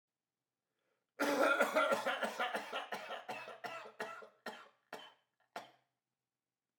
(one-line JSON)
{"cough_length": "6.8 s", "cough_amplitude": 4267, "cough_signal_mean_std_ratio": 0.45, "survey_phase": "beta (2021-08-13 to 2022-03-07)", "age": "18-44", "gender": "Male", "wearing_mask": "Yes", "symptom_cough_any": true, "symptom_runny_or_blocked_nose": true, "symptom_sore_throat": true, "symptom_fatigue": true, "symptom_fever_high_temperature": true, "symptom_headache": true, "symptom_onset": "4 days", "smoker_status": "Never smoked", "respiratory_condition_asthma": false, "respiratory_condition_other": false, "recruitment_source": "Test and Trace", "submission_delay": "1 day", "covid_test_result": "Positive", "covid_test_method": "RT-qPCR", "covid_ct_value": 22.6, "covid_ct_gene": "N gene"}